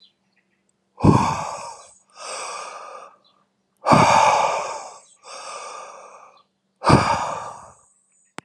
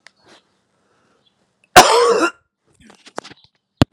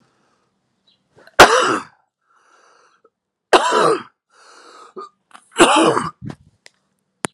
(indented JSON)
{
  "exhalation_length": "8.4 s",
  "exhalation_amplitude": 31219,
  "exhalation_signal_mean_std_ratio": 0.42,
  "cough_length": "3.9 s",
  "cough_amplitude": 32768,
  "cough_signal_mean_std_ratio": 0.28,
  "three_cough_length": "7.3 s",
  "three_cough_amplitude": 32768,
  "three_cough_signal_mean_std_ratio": 0.33,
  "survey_phase": "alpha (2021-03-01 to 2021-08-12)",
  "age": "18-44",
  "gender": "Male",
  "wearing_mask": "No",
  "symptom_cough_any": true,
  "symptom_fatigue": true,
  "symptom_headache": true,
  "symptom_change_to_sense_of_smell_or_taste": true,
  "symptom_loss_of_taste": true,
  "symptom_onset": "6 days",
  "smoker_status": "Current smoker (11 or more cigarettes per day)",
  "respiratory_condition_asthma": false,
  "respiratory_condition_other": false,
  "recruitment_source": "Test and Trace",
  "submission_delay": "2 days",
  "covid_test_result": "Positive",
  "covid_test_method": "RT-qPCR",
  "covid_ct_value": 25.5,
  "covid_ct_gene": "N gene"
}